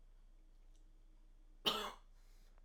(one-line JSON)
{"cough_length": "2.6 s", "cough_amplitude": 3061, "cough_signal_mean_std_ratio": 0.42, "survey_phase": "alpha (2021-03-01 to 2021-08-12)", "age": "18-44", "gender": "Male", "wearing_mask": "No", "symptom_none": true, "smoker_status": "Never smoked", "respiratory_condition_asthma": false, "respiratory_condition_other": false, "recruitment_source": "REACT", "submission_delay": "2 days", "covid_test_result": "Negative", "covid_test_method": "RT-qPCR"}